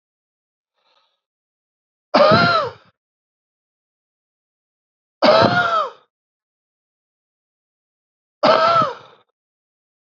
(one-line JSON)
{"three_cough_length": "10.2 s", "three_cough_amplitude": 28239, "three_cough_signal_mean_std_ratio": 0.33, "survey_phase": "beta (2021-08-13 to 2022-03-07)", "age": "18-44", "gender": "Male", "wearing_mask": "No", "symptom_shortness_of_breath": true, "symptom_fatigue": true, "symptom_change_to_sense_of_smell_or_taste": true, "symptom_onset": "6 days", "smoker_status": "Ex-smoker", "respiratory_condition_asthma": false, "respiratory_condition_other": false, "recruitment_source": "Test and Trace", "submission_delay": "2 days", "covid_test_result": "Positive", "covid_test_method": "RT-qPCR", "covid_ct_value": 21.8, "covid_ct_gene": "ORF1ab gene", "covid_ct_mean": 22.0, "covid_viral_load": "60000 copies/ml", "covid_viral_load_category": "Low viral load (10K-1M copies/ml)"}